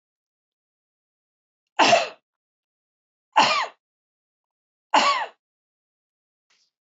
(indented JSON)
{
  "three_cough_length": "7.0 s",
  "three_cough_amplitude": 18489,
  "three_cough_signal_mean_std_ratio": 0.27,
  "survey_phase": "beta (2021-08-13 to 2022-03-07)",
  "age": "45-64",
  "gender": "Female",
  "wearing_mask": "No",
  "symptom_none": true,
  "smoker_status": "Current smoker (e-cigarettes or vapes only)",
  "respiratory_condition_asthma": false,
  "respiratory_condition_other": false,
  "recruitment_source": "Test and Trace",
  "submission_delay": "-1 day",
  "covid_test_result": "Negative",
  "covid_test_method": "LFT"
}